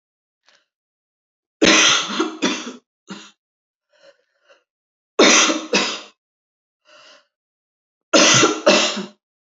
{"three_cough_length": "9.6 s", "three_cough_amplitude": 31532, "three_cough_signal_mean_std_ratio": 0.38, "survey_phase": "alpha (2021-03-01 to 2021-08-12)", "age": "45-64", "gender": "Female", "wearing_mask": "No", "symptom_none": true, "symptom_onset": "6 days", "smoker_status": "Ex-smoker", "respiratory_condition_asthma": false, "respiratory_condition_other": false, "recruitment_source": "REACT", "submission_delay": "1 day", "covid_test_result": "Negative", "covid_test_method": "RT-qPCR"}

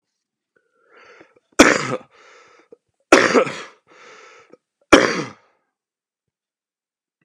{"three_cough_length": "7.2 s", "three_cough_amplitude": 32768, "three_cough_signal_mean_std_ratio": 0.26, "survey_phase": "beta (2021-08-13 to 2022-03-07)", "age": "18-44", "gender": "Male", "wearing_mask": "No", "symptom_cough_any": true, "symptom_new_continuous_cough": true, "symptom_runny_or_blocked_nose": true, "symptom_onset": "3 days", "smoker_status": "Ex-smoker", "respiratory_condition_asthma": true, "respiratory_condition_other": false, "recruitment_source": "Test and Trace", "submission_delay": "2 days", "covid_test_result": "Positive", "covid_test_method": "RT-qPCR", "covid_ct_value": 19.9, "covid_ct_gene": "N gene", "covid_ct_mean": 20.1, "covid_viral_load": "250000 copies/ml", "covid_viral_load_category": "Low viral load (10K-1M copies/ml)"}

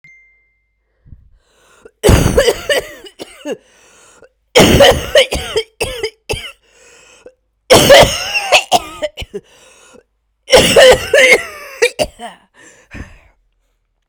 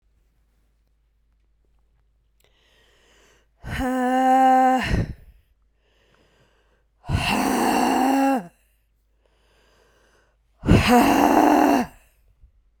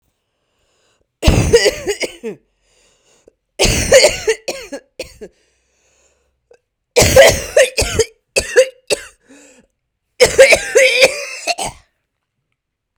{"cough_length": "14.1 s", "cough_amplitude": 32768, "cough_signal_mean_std_ratio": 0.42, "exhalation_length": "12.8 s", "exhalation_amplitude": 27036, "exhalation_signal_mean_std_ratio": 0.47, "three_cough_length": "13.0 s", "three_cough_amplitude": 32768, "three_cough_signal_mean_std_ratio": 0.4, "survey_phase": "beta (2021-08-13 to 2022-03-07)", "age": "18-44", "gender": "Female", "wearing_mask": "No", "symptom_cough_any": true, "symptom_new_continuous_cough": true, "symptom_shortness_of_breath": true, "symptom_sore_throat": true, "symptom_diarrhoea": true, "symptom_fatigue": true, "symptom_other": true, "symptom_onset": "3 days", "smoker_status": "Ex-smoker", "respiratory_condition_asthma": false, "respiratory_condition_other": false, "recruitment_source": "Test and Trace", "submission_delay": "2 days", "covid_test_result": "Positive", "covid_test_method": "RT-qPCR", "covid_ct_value": 30.8, "covid_ct_gene": "ORF1ab gene", "covid_ct_mean": 31.8, "covid_viral_load": "37 copies/ml", "covid_viral_load_category": "Minimal viral load (< 10K copies/ml)"}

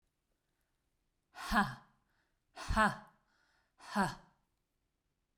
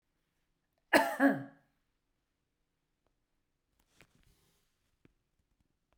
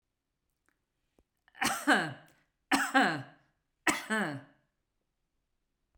{"exhalation_length": "5.4 s", "exhalation_amplitude": 4836, "exhalation_signal_mean_std_ratio": 0.3, "cough_length": "6.0 s", "cough_amplitude": 8488, "cough_signal_mean_std_ratio": 0.2, "three_cough_length": "6.0 s", "three_cough_amplitude": 8327, "three_cough_signal_mean_std_ratio": 0.36, "survey_phase": "beta (2021-08-13 to 2022-03-07)", "age": "65+", "gender": "Female", "wearing_mask": "No", "symptom_none": true, "smoker_status": "Ex-smoker", "respiratory_condition_asthma": false, "respiratory_condition_other": false, "recruitment_source": "REACT", "submission_delay": "1 day", "covid_test_result": "Negative", "covid_test_method": "RT-qPCR"}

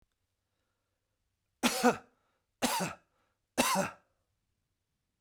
{"three_cough_length": "5.2 s", "three_cough_amplitude": 8002, "three_cough_signal_mean_std_ratio": 0.32, "survey_phase": "beta (2021-08-13 to 2022-03-07)", "age": "65+", "gender": "Male", "wearing_mask": "No", "symptom_none": true, "smoker_status": "Never smoked", "respiratory_condition_asthma": false, "respiratory_condition_other": false, "recruitment_source": "REACT", "submission_delay": "2 days", "covid_test_result": "Negative", "covid_test_method": "RT-qPCR", "influenza_a_test_result": "Negative", "influenza_b_test_result": "Negative"}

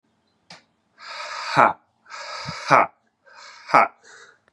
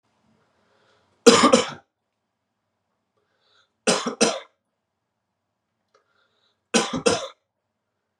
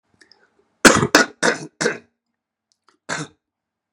{"exhalation_length": "4.5 s", "exhalation_amplitude": 32532, "exhalation_signal_mean_std_ratio": 0.32, "three_cough_length": "8.2 s", "three_cough_amplitude": 32767, "three_cough_signal_mean_std_ratio": 0.26, "cough_length": "3.9 s", "cough_amplitude": 32768, "cough_signal_mean_std_ratio": 0.29, "survey_phase": "beta (2021-08-13 to 2022-03-07)", "age": "18-44", "gender": "Male", "wearing_mask": "No", "symptom_cough_any": true, "symptom_runny_or_blocked_nose": true, "symptom_sore_throat": true, "symptom_fatigue": true, "symptom_headache": true, "smoker_status": "Ex-smoker", "respiratory_condition_asthma": false, "respiratory_condition_other": false, "recruitment_source": "Test and Trace", "submission_delay": "2 days", "covid_test_result": "Positive", "covid_test_method": "RT-qPCR", "covid_ct_value": 18.9, "covid_ct_gene": "N gene"}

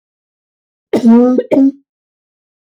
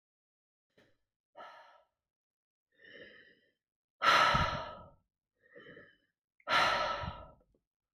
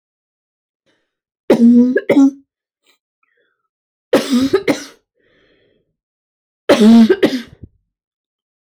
{"cough_length": "2.7 s", "cough_amplitude": 31341, "cough_signal_mean_std_ratio": 0.44, "exhalation_length": "7.9 s", "exhalation_amplitude": 6685, "exhalation_signal_mean_std_ratio": 0.33, "three_cough_length": "8.8 s", "three_cough_amplitude": 31098, "three_cough_signal_mean_std_ratio": 0.38, "survey_phase": "beta (2021-08-13 to 2022-03-07)", "age": "45-64", "gender": "Female", "wearing_mask": "No", "symptom_runny_or_blocked_nose": true, "symptom_other": true, "symptom_onset": "6 days", "smoker_status": "Never smoked", "respiratory_condition_asthma": false, "respiratory_condition_other": false, "recruitment_source": "REACT", "submission_delay": "2 days", "covid_test_result": "Negative", "covid_test_method": "RT-qPCR", "influenza_a_test_result": "Negative", "influenza_b_test_result": "Negative"}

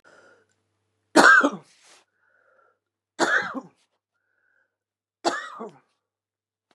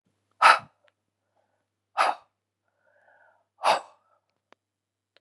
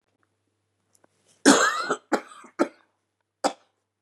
{"three_cough_length": "6.7 s", "three_cough_amplitude": 32637, "three_cough_signal_mean_std_ratio": 0.26, "exhalation_length": "5.2 s", "exhalation_amplitude": 23639, "exhalation_signal_mean_std_ratio": 0.22, "cough_length": "4.0 s", "cough_amplitude": 27251, "cough_signal_mean_std_ratio": 0.29, "survey_phase": "beta (2021-08-13 to 2022-03-07)", "age": "45-64", "gender": "Female", "wearing_mask": "No", "symptom_cough_any": true, "symptom_runny_or_blocked_nose": true, "symptom_shortness_of_breath": true, "symptom_headache": true, "symptom_onset": "12 days", "smoker_status": "Current smoker (11 or more cigarettes per day)", "respiratory_condition_asthma": false, "respiratory_condition_other": false, "recruitment_source": "REACT", "submission_delay": "1 day", "covid_test_result": "Negative", "covid_test_method": "RT-qPCR", "influenza_a_test_result": "Negative", "influenza_b_test_result": "Negative"}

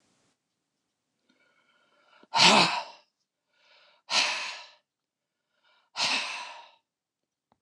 {"exhalation_length": "7.6 s", "exhalation_amplitude": 16925, "exhalation_signal_mean_std_ratio": 0.3, "survey_phase": "beta (2021-08-13 to 2022-03-07)", "age": "65+", "gender": "Male", "wearing_mask": "No", "symptom_none": true, "smoker_status": "Ex-smoker", "respiratory_condition_asthma": false, "respiratory_condition_other": false, "recruitment_source": "REACT", "submission_delay": "4 days", "covid_test_result": "Negative", "covid_test_method": "RT-qPCR", "influenza_a_test_result": "Negative", "influenza_b_test_result": "Negative"}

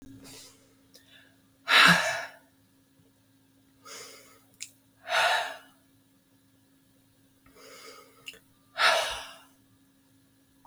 {"exhalation_length": "10.7 s", "exhalation_amplitude": 21564, "exhalation_signal_mean_std_ratio": 0.29, "survey_phase": "beta (2021-08-13 to 2022-03-07)", "age": "45-64", "gender": "Female", "wearing_mask": "No", "symptom_runny_or_blocked_nose": true, "symptom_sore_throat": true, "symptom_headache": true, "smoker_status": "Ex-smoker", "respiratory_condition_asthma": false, "respiratory_condition_other": false, "recruitment_source": "Test and Trace", "submission_delay": "1 day", "covid_test_result": "Negative", "covid_test_method": "ePCR"}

